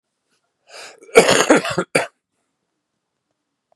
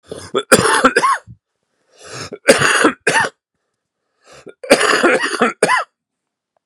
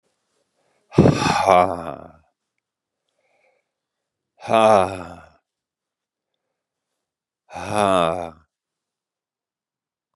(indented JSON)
{
  "cough_length": "3.8 s",
  "cough_amplitude": 32768,
  "cough_signal_mean_std_ratio": 0.3,
  "three_cough_length": "6.7 s",
  "three_cough_amplitude": 32768,
  "three_cough_signal_mean_std_ratio": 0.48,
  "exhalation_length": "10.2 s",
  "exhalation_amplitude": 32768,
  "exhalation_signal_mean_std_ratio": 0.3,
  "survey_phase": "beta (2021-08-13 to 2022-03-07)",
  "age": "45-64",
  "gender": "Male",
  "wearing_mask": "No",
  "symptom_cough_any": true,
  "symptom_runny_or_blocked_nose": true,
  "symptom_abdominal_pain": true,
  "symptom_diarrhoea": true,
  "symptom_fatigue": true,
  "symptom_headache": true,
  "symptom_onset": "4 days",
  "smoker_status": "Ex-smoker",
  "respiratory_condition_asthma": false,
  "respiratory_condition_other": false,
  "recruitment_source": "Test and Trace",
  "submission_delay": "2 days",
  "covid_test_result": "Positive",
  "covid_test_method": "RT-qPCR",
  "covid_ct_value": 25.8,
  "covid_ct_gene": "ORF1ab gene"
}